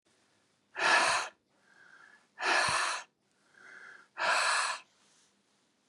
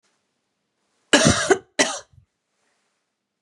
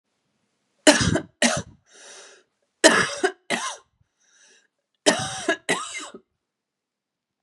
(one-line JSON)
{"exhalation_length": "5.9 s", "exhalation_amplitude": 7249, "exhalation_signal_mean_std_ratio": 0.46, "cough_length": "3.4 s", "cough_amplitude": 30212, "cough_signal_mean_std_ratio": 0.3, "three_cough_length": "7.4 s", "three_cough_amplitude": 32697, "three_cough_signal_mean_std_ratio": 0.33, "survey_phase": "beta (2021-08-13 to 2022-03-07)", "age": "45-64", "gender": "Female", "wearing_mask": "No", "symptom_cough_any": true, "symptom_runny_or_blocked_nose": true, "symptom_sore_throat": true, "symptom_fatigue": true, "symptom_fever_high_temperature": true, "symptom_headache": true, "symptom_other": true, "smoker_status": "Ex-smoker", "respiratory_condition_asthma": false, "respiratory_condition_other": false, "recruitment_source": "Test and Trace", "submission_delay": "2 days", "covid_test_result": "Positive", "covid_test_method": "RT-qPCR", "covid_ct_value": 24.9, "covid_ct_gene": "N gene", "covid_ct_mean": 25.3, "covid_viral_load": "5000 copies/ml", "covid_viral_load_category": "Minimal viral load (< 10K copies/ml)"}